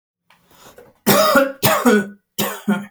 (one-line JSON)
{"cough_length": "2.9 s", "cough_amplitude": 32768, "cough_signal_mean_std_ratio": 0.54, "survey_phase": "alpha (2021-03-01 to 2021-08-12)", "age": "18-44", "gender": "Male", "wearing_mask": "No", "symptom_none": true, "smoker_status": "Never smoked", "respiratory_condition_asthma": false, "respiratory_condition_other": false, "recruitment_source": "REACT", "submission_delay": "1 day", "covid_test_result": "Negative", "covid_test_method": "RT-qPCR"}